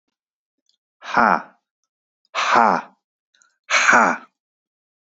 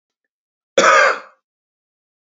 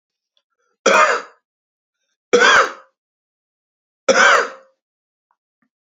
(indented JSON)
{
  "exhalation_length": "5.1 s",
  "exhalation_amplitude": 27800,
  "exhalation_signal_mean_std_ratio": 0.36,
  "cough_length": "2.4 s",
  "cough_amplitude": 29673,
  "cough_signal_mean_std_ratio": 0.33,
  "three_cough_length": "5.9 s",
  "three_cough_amplitude": 30005,
  "three_cough_signal_mean_std_ratio": 0.35,
  "survey_phase": "beta (2021-08-13 to 2022-03-07)",
  "age": "45-64",
  "gender": "Male",
  "wearing_mask": "No",
  "symptom_none": true,
  "smoker_status": "Ex-smoker",
  "respiratory_condition_asthma": false,
  "respiratory_condition_other": false,
  "recruitment_source": "REACT",
  "submission_delay": "1 day",
  "covid_test_result": "Negative",
  "covid_test_method": "RT-qPCR"
}